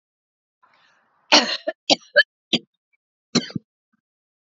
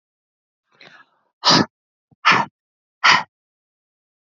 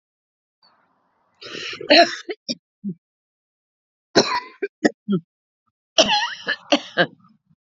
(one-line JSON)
{"cough_length": "4.5 s", "cough_amplitude": 29524, "cough_signal_mean_std_ratio": 0.24, "exhalation_length": "4.4 s", "exhalation_amplitude": 30460, "exhalation_signal_mean_std_ratio": 0.28, "three_cough_length": "7.7 s", "three_cough_amplitude": 32768, "three_cough_signal_mean_std_ratio": 0.32, "survey_phase": "alpha (2021-03-01 to 2021-08-12)", "age": "45-64", "gender": "Female", "wearing_mask": "No", "symptom_none": true, "smoker_status": "Never smoked", "respiratory_condition_asthma": false, "respiratory_condition_other": false, "recruitment_source": "REACT", "submission_delay": "4 days", "covid_test_result": "Negative", "covid_test_method": "RT-qPCR"}